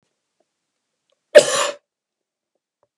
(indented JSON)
{
  "cough_length": "3.0 s",
  "cough_amplitude": 32768,
  "cough_signal_mean_std_ratio": 0.2,
  "survey_phase": "beta (2021-08-13 to 2022-03-07)",
  "age": "65+",
  "gender": "Male",
  "wearing_mask": "No",
  "symptom_none": true,
  "smoker_status": "Never smoked",
  "respiratory_condition_asthma": false,
  "respiratory_condition_other": false,
  "recruitment_source": "REACT",
  "submission_delay": "1 day",
  "covid_test_result": "Negative",
  "covid_test_method": "RT-qPCR",
  "influenza_a_test_result": "Negative",
  "influenza_b_test_result": "Negative"
}